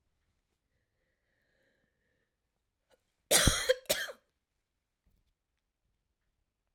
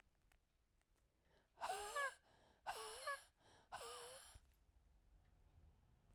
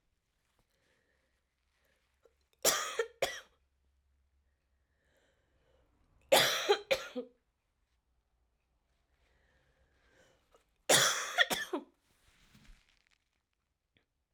{"cough_length": "6.7 s", "cough_amplitude": 10787, "cough_signal_mean_std_ratio": 0.21, "exhalation_length": "6.1 s", "exhalation_amplitude": 719, "exhalation_signal_mean_std_ratio": 0.44, "three_cough_length": "14.3 s", "three_cough_amplitude": 8450, "three_cough_signal_mean_std_ratio": 0.26, "survey_phase": "beta (2021-08-13 to 2022-03-07)", "age": "45-64", "gender": "Female", "wearing_mask": "No", "symptom_cough_any": true, "symptom_new_continuous_cough": true, "symptom_runny_or_blocked_nose": true, "symptom_headache": true, "symptom_onset": "3 days", "smoker_status": "Ex-smoker", "respiratory_condition_asthma": false, "respiratory_condition_other": false, "recruitment_source": "Test and Trace", "submission_delay": "1 day", "covid_test_result": "Positive", "covid_test_method": "RT-qPCR", "covid_ct_value": 16.2, "covid_ct_gene": "N gene", "covid_ct_mean": 17.5, "covid_viral_load": "1800000 copies/ml", "covid_viral_load_category": "High viral load (>1M copies/ml)"}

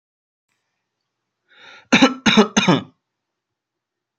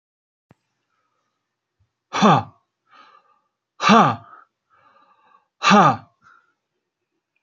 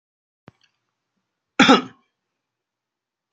{"three_cough_length": "4.2 s", "three_cough_amplitude": 29438, "three_cough_signal_mean_std_ratio": 0.3, "exhalation_length": "7.4 s", "exhalation_amplitude": 29792, "exhalation_signal_mean_std_ratio": 0.28, "cough_length": "3.3 s", "cough_amplitude": 32640, "cough_signal_mean_std_ratio": 0.2, "survey_phase": "beta (2021-08-13 to 2022-03-07)", "age": "18-44", "gender": "Male", "wearing_mask": "No", "symptom_shortness_of_breath": true, "smoker_status": "Never smoked", "respiratory_condition_asthma": false, "respiratory_condition_other": false, "recruitment_source": "REACT", "submission_delay": "5 days", "covid_test_result": "Negative", "covid_test_method": "RT-qPCR", "influenza_a_test_result": "Negative", "influenza_b_test_result": "Negative"}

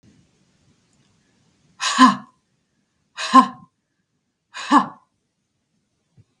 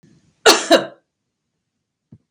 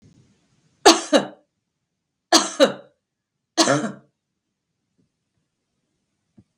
{"exhalation_length": "6.4 s", "exhalation_amplitude": 32768, "exhalation_signal_mean_std_ratio": 0.24, "cough_length": "2.3 s", "cough_amplitude": 32768, "cough_signal_mean_std_ratio": 0.27, "three_cough_length": "6.6 s", "three_cough_amplitude": 32767, "three_cough_signal_mean_std_ratio": 0.26, "survey_phase": "beta (2021-08-13 to 2022-03-07)", "age": "65+", "gender": "Female", "wearing_mask": "No", "symptom_none": true, "smoker_status": "Never smoked", "respiratory_condition_asthma": false, "respiratory_condition_other": false, "recruitment_source": "REACT", "submission_delay": "3 days", "covid_test_result": "Negative", "covid_test_method": "RT-qPCR", "influenza_a_test_result": "Negative", "influenza_b_test_result": "Negative"}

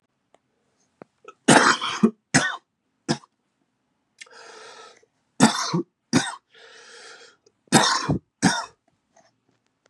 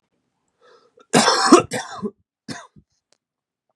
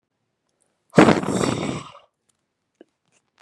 {"three_cough_length": "9.9 s", "three_cough_amplitude": 31702, "three_cough_signal_mean_std_ratio": 0.33, "cough_length": "3.8 s", "cough_amplitude": 32768, "cough_signal_mean_std_ratio": 0.3, "exhalation_length": "3.4 s", "exhalation_amplitude": 32767, "exhalation_signal_mean_std_ratio": 0.3, "survey_phase": "beta (2021-08-13 to 2022-03-07)", "age": "18-44", "gender": "Male", "wearing_mask": "No", "symptom_new_continuous_cough": true, "symptom_runny_or_blocked_nose": true, "symptom_sore_throat": true, "symptom_fatigue": true, "symptom_change_to_sense_of_smell_or_taste": true, "symptom_onset": "6 days", "smoker_status": "Never smoked", "respiratory_condition_asthma": false, "respiratory_condition_other": false, "recruitment_source": "Test and Trace", "submission_delay": "5 days", "covid_test_result": "Positive", "covid_test_method": "RT-qPCR"}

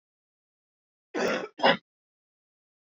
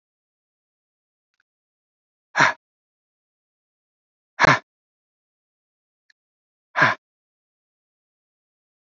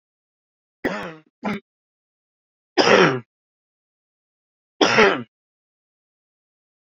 {"cough_length": "2.8 s", "cough_amplitude": 15516, "cough_signal_mean_std_ratio": 0.28, "exhalation_length": "8.9 s", "exhalation_amplitude": 27724, "exhalation_signal_mean_std_ratio": 0.17, "three_cough_length": "7.0 s", "three_cough_amplitude": 30661, "three_cough_signal_mean_std_ratio": 0.29, "survey_phase": "beta (2021-08-13 to 2022-03-07)", "age": "45-64", "gender": "Male", "wearing_mask": "No", "symptom_none": true, "smoker_status": "Ex-smoker", "respiratory_condition_asthma": false, "respiratory_condition_other": false, "recruitment_source": "REACT", "submission_delay": "3 days", "covid_test_result": "Negative", "covid_test_method": "RT-qPCR"}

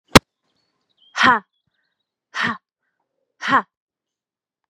{"exhalation_length": "4.7 s", "exhalation_amplitude": 32768, "exhalation_signal_mean_std_ratio": 0.23, "survey_phase": "beta (2021-08-13 to 2022-03-07)", "age": "18-44", "gender": "Female", "wearing_mask": "No", "symptom_cough_any": true, "symptom_fatigue": true, "symptom_onset": "4 days", "smoker_status": "Never smoked", "respiratory_condition_asthma": false, "respiratory_condition_other": false, "recruitment_source": "Test and Trace", "submission_delay": "2 days", "covid_test_result": "Positive", "covid_test_method": "RT-qPCR", "covid_ct_value": 18.5, "covid_ct_gene": "ORF1ab gene", "covid_ct_mean": 19.1, "covid_viral_load": "540000 copies/ml", "covid_viral_load_category": "Low viral load (10K-1M copies/ml)"}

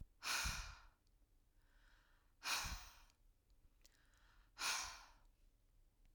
{"exhalation_length": "6.1 s", "exhalation_amplitude": 1260, "exhalation_signal_mean_std_ratio": 0.43, "survey_phase": "alpha (2021-03-01 to 2021-08-12)", "age": "45-64", "gender": "Female", "wearing_mask": "No", "symptom_none": true, "smoker_status": "Never smoked", "respiratory_condition_asthma": false, "respiratory_condition_other": false, "recruitment_source": "REACT", "submission_delay": "2 days", "covid_test_result": "Negative", "covid_test_method": "RT-qPCR"}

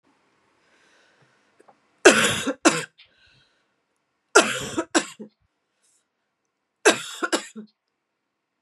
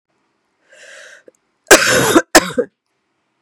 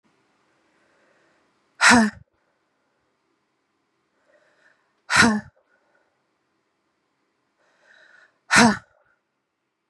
{"three_cough_length": "8.6 s", "three_cough_amplitude": 32767, "three_cough_signal_mean_std_ratio": 0.27, "cough_length": "3.4 s", "cough_amplitude": 32768, "cough_signal_mean_std_ratio": 0.34, "exhalation_length": "9.9 s", "exhalation_amplitude": 28806, "exhalation_signal_mean_std_ratio": 0.23, "survey_phase": "beta (2021-08-13 to 2022-03-07)", "age": "45-64", "gender": "Female", "wearing_mask": "No", "symptom_runny_or_blocked_nose": true, "symptom_fatigue": true, "symptom_fever_high_temperature": true, "symptom_headache": true, "symptom_change_to_sense_of_smell_or_taste": true, "symptom_onset": "3 days", "smoker_status": "Ex-smoker", "respiratory_condition_asthma": false, "respiratory_condition_other": false, "recruitment_source": "Test and Trace", "submission_delay": "2 days", "covid_test_result": "Positive", "covid_test_method": "RT-qPCR", "covid_ct_value": 16.9, "covid_ct_gene": "ORF1ab gene", "covid_ct_mean": 17.6, "covid_viral_load": "1700000 copies/ml", "covid_viral_load_category": "High viral load (>1M copies/ml)"}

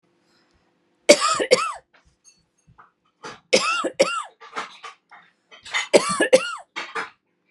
{"three_cough_length": "7.5 s", "three_cough_amplitude": 32768, "three_cough_signal_mean_std_ratio": 0.36, "survey_phase": "beta (2021-08-13 to 2022-03-07)", "age": "45-64", "gender": "Female", "wearing_mask": "No", "symptom_none": true, "smoker_status": "Ex-smoker", "respiratory_condition_asthma": false, "respiratory_condition_other": false, "recruitment_source": "REACT", "submission_delay": "2 days", "covid_test_result": "Negative", "covid_test_method": "RT-qPCR", "influenza_a_test_result": "Negative", "influenza_b_test_result": "Negative"}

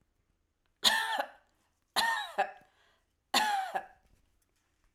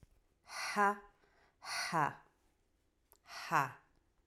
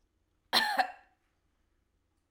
{"three_cough_length": "4.9 s", "three_cough_amplitude": 10277, "three_cough_signal_mean_std_ratio": 0.41, "exhalation_length": "4.3 s", "exhalation_amplitude": 5063, "exhalation_signal_mean_std_ratio": 0.38, "cough_length": "2.3 s", "cough_amplitude": 7809, "cough_signal_mean_std_ratio": 0.3, "survey_phase": "alpha (2021-03-01 to 2021-08-12)", "age": "45-64", "gender": "Female", "wearing_mask": "No", "symptom_none": true, "smoker_status": "Never smoked", "respiratory_condition_asthma": false, "respiratory_condition_other": false, "recruitment_source": "REACT", "submission_delay": "2 days", "covid_test_result": "Negative", "covid_test_method": "RT-qPCR"}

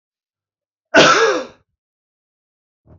{"exhalation_length": "3.0 s", "exhalation_amplitude": 30367, "exhalation_signal_mean_std_ratio": 0.32, "survey_phase": "beta (2021-08-13 to 2022-03-07)", "age": "45-64", "gender": "Male", "wearing_mask": "No", "symptom_cough_any": true, "symptom_new_continuous_cough": true, "symptom_runny_or_blocked_nose": true, "symptom_sore_throat": true, "symptom_fatigue": true, "symptom_headache": true, "symptom_onset": "4 days", "smoker_status": "Ex-smoker", "respiratory_condition_asthma": false, "respiratory_condition_other": false, "recruitment_source": "Test and Trace", "submission_delay": "2 days", "covid_test_result": "Positive", "covid_test_method": "RT-qPCR", "covid_ct_value": 25.1, "covid_ct_gene": "N gene"}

